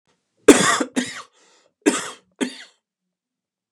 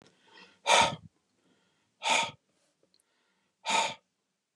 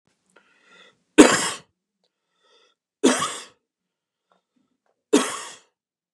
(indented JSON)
{
  "cough_length": "3.7 s",
  "cough_amplitude": 32768,
  "cough_signal_mean_std_ratio": 0.29,
  "exhalation_length": "4.6 s",
  "exhalation_amplitude": 13129,
  "exhalation_signal_mean_std_ratio": 0.32,
  "three_cough_length": "6.1 s",
  "three_cough_amplitude": 32768,
  "three_cough_signal_mean_std_ratio": 0.24,
  "survey_phase": "beta (2021-08-13 to 2022-03-07)",
  "age": "45-64",
  "gender": "Male",
  "wearing_mask": "No",
  "symptom_none": true,
  "smoker_status": "Ex-smoker",
  "respiratory_condition_asthma": false,
  "respiratory_condition_other": false,
  "recruitment_source": "REACT",
  "submission_delay": "2 days",
  "covid_test_result": "Negative",
  "covid_test_method": "RT-qPCR",
  "influenza_a_test_result": "Negative",
  "influenza_b_test_result": "Negative"
}